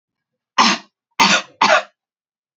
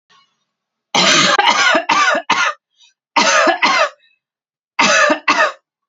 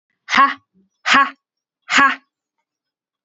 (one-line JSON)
{"cough_length": "2.6 s", "cough_amplitude": 29164, "cough_signal_mean_std_ratio": 0.4, "three_cough_length": "5.9 s", "three_cough_amplitude": 32767, "three_cough_signal_mean_std_ratio": 0.62, "exhalation_length": "3.2 s", "exhalation_amplitude": 30991, "exhalation_signal_mean_std_ratio": 0.36, "survey_phase": "alpha (2021-03-01 to 2021-08-12)", "age": "18-44", "gender": "Female", "wearing_mask": "No", "symptom_none": true, "smoker_status": "Never smoked", "respiratory_condition_asthma": false, "respiratory_condition_other": false, "recruitment_source": "REACT", "submission_delay": "1 day", "covid_test_result": "Negative", "covid_test_method": "RT-qPCR"}